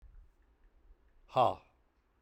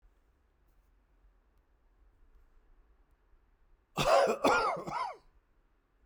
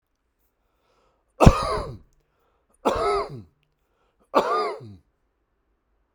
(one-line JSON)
{"exhalation_length": "2.2 s", "exhalation_amplitude": 5759, "exhalation_signal_mean_std_ratio": 0.25, "cough_length": "6.1 s", "cough_amplitude": 7047, "cough_signal_mean_std_ratio": 0.33, "three_cough_length": "6.1 s", "three_cough_amplitude": 32768, "three_cough_signal_mean_std_ratio": 0.29, "survey_phase": "beta (2021-08-13 to 2022-03-07)", "age": "45-64", "gender": "Male", "wearing_mask": "No", "symptom_none": true, "smoker_status": "Never smoked", "respiratory_condition_asthma": false, "respiratory_condition_other": false, "recruitment_source": "REACT", "submission_delay": "1 day", "covid_test_result": "Negative", "covid_test_method": "RT-qPCR", "influenza_a_test_result": "Negative", "influenza_b_test_result": "Negative"}